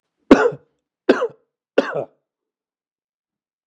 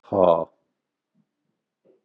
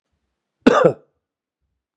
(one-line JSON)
{"three_cough_length": "3.7 s", "three_cough_amplitude": 32768, "three_cough_signal_mean_std_ratio": 0.25, "exhalation_length": "2.0 s", "exhalation_amplitude": 20950, "exhalation_signal_mean_std_ratio": 0.27, "cough_length": "2.0 s", "cough_amplitude": 32768, "cough_signal_mean_std_ratio": 0.27, "survey_phase": "beta (2021-08-13 to 2022-03-07)", "age": "45-64", "gender": "Male", "wearing_mask": "No", "symptom_none": true, "smoker_status": "Ex-smoker", "respiratory_condition_asthma": false, "respiratory_condition_other": false, "recruitment_source": "REACT", "submission_delay": "1 day", "covid_test_result": "Negative", "covid_test_method": "RT-qPCR", "influenza_a_test_result": "Negative", "influenza_b_test_result": "Negative"}